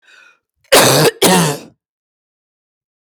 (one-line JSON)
{"cough_length": "3.1 s", "cough_amplitude": 32768, "cough_signal_mean_std_ratio": 0.43, "survey_phase": "beta (2021-08-13 to 2022-03-07)", "age": "45-64", "gender": "Female", "wearing_mask": "No", "symptom_runny_or_blocked_nose": true, "symptom_fatigue": true, "smoker_status": "Ex-smoker", "respiratory_condition_asthma": false, "respiratory_condition_other": true, "recruitment_source": "REACT", "submission_delay": "3 days", "covid_test_result": "Negative", "covid_test_method": "RT-qPCR"}